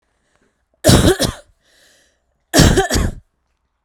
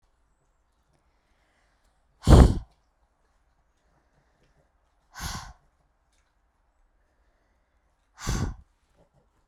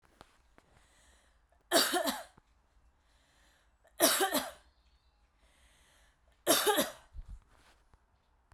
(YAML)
cough_length: 3.8 s
cough_amplitude: 32768
cough_signal_mean_std_ratio: 0.4
exhalation_length: 9.5 s
exhalation_amplitude: 29657
exhalation_signal_mean_std_ratio: 0.17
three_cough_length: 8.5 s
three_cough_amplitude: 10180
three_cough_signal_mean_std_ratio: 0.33
survey_phase: beta (2021-08-13 to 2022-03-07)
age: 18-44
gender: Female
wearing_mask: 'No'
symptom_none: true
symptom_onset: 2 days
smoker_status: Never smoked
respiratory_condition_asthma: true
respiratory_condition_other: false
recruitment_source: REACT
submission_delay: 1 day
covid_test_result: Negative
covid_test_method: RT-qPCR